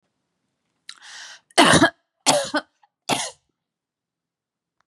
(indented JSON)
{
  "three_cough_length": "4.9 s",
  "three_cough_amplitude": 30962,
  "three_cough_signal_mean_std_ratio": 0.3,
  "survey_phase": "beta (2021-08-13 to 2022-03-07)",
  "age": "45-64",
  "gender": "Female",
  "wearing_mask": "No",
  "symptom_none": true,
  "smoker_status": "Ex-smoker",
  "respiratory_condition_asthma": false,
  "respiratory_condition_other": false,
  "recruitment_source": "REACT",
  "submission_delay": "1 day",
  "covid_test_result": "Negative",
  "covid_test_method": "RT-qPCR",
  "influenza_a_test_result": "Negative",
  "influenza_b_test_result": "Negative"
}